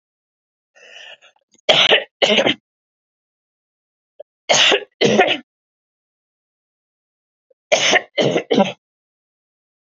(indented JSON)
{
  "three_cough_length": "9.9 s",
  "three_cough_amplitude": 32532,
  "three_cough_signal_mean_std_ratio": 0.36,
  "survey_phase": "beta (2021-08-13 to 2022-03-07)",
  "age": "18-44",
  "gender": "Female",
  "wearing_mask": "No",
  "symptom_none": true,
  "smoker_status": "Never smoked",
  "respiratory_condition_asthma": false,
  "respiratory_condition_other": false,
  "recruitment_source": "REACT",
  "submission_delay": "1 day",
  "covid_test_result": "Negative",
  "covid_test_method": "RT-qPCR",
  "influenza_a_test_result": "Negative",
  "influenza_b_test_result": "Negative"
}